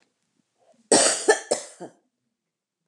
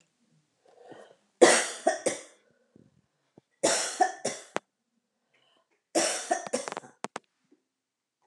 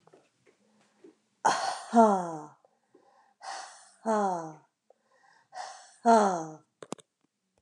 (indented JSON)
{
  "cough_length": "2.9 s",
  "cough_amplitude": 19784,
  "cough_signal_mean_std_ratio": 0.32,
  "three_cough_length": "8.3 s",
  "three_cough_amplitude": 25360,
  "three_cough_signal_mean_std_ratio": 0.31,
  "exhalation_length": "7.6 s",
  "exhalation_amplitude": 14198,
  "exhalation_signal_mean_std_ratio": 0.34,
  "survey_phase": "beta (2021-08-13 to 2022-03-07)",
  "age": "45-64",
  "gender": "Female",
  "wearing_mask": "No",
  "symptom_none": true,
  "smoker_status": "Current smoker (e-cigarettes or vapes only)",
  "respiratory_condition_asthma": false,
  "respiratory_condition_other": false,
  "recruitment_source": "REACT",
  "submission_delay": "2 days",
  "covid_test_result": "Negative",
  "covid_test_method": "RT-qPCR",
  "influenza_a_test_result": "Negative",
  "influenza_b_test_result": "Negative"
}